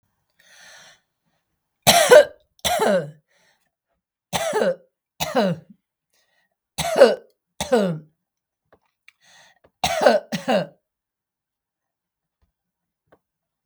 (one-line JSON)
{"cough_length": "13.7 s", "cough_amplitude": 32768, "cough_signal_mean_std_ratio": 0.31, "survey_phase": "beta (2021-08-13 to 2022-03-07)", "age": "65+", "gender": "Female", "wearing_mask": "No", "symptom_none": true, "smoker_status": "Never smoked", "respiratory_condition_asthma": false, "respiratory_condition_other": false, "recruitment_source": "REACT", "submission_delay": "3 days", "covid_test_result": "Negative", "covid_test_method": "RT-qPCR", "influenza_a_test_result": "Negative", "influenza_b_test_result": "Negative"}